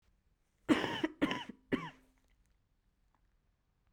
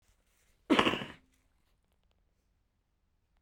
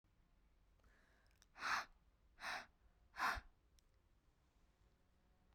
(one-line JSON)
{"three_cough_length": "3.9 s", "three_cough_amplitude": 5097, "three_cough_signal_mean_std_ratio": 0.31, "cough_length": "3.4 s", "cough_amplitude": 15761, "cough_signal_mean_std_ratio": 0.22, "exhalation_length": "5.5 s", "exhalation_amplitude": 1169, "exhalation_signal_mean_std_ratio": 0.32, "survey_phase": "beta (2021-08-13 to 2022-03-07)", "age": "18-44", "gender": "Female", "wearing_mask": "No", "symptom_cough_any": true, "symptom_new_continuous_cough": true, "symptom_sore_throat": true, "symptom_fatigue": true, "symptom_headache": true, "symptom_onset": "3 days", "smoker_status": "Never smoked", "respiratory_condition_asthma": false, "respiratory_condition_other": false, "recruitment_source": "Test and Trace", "submission_delay": "1 day", "covid_test_result": "Positive", "covid_test_method": "ePCR"}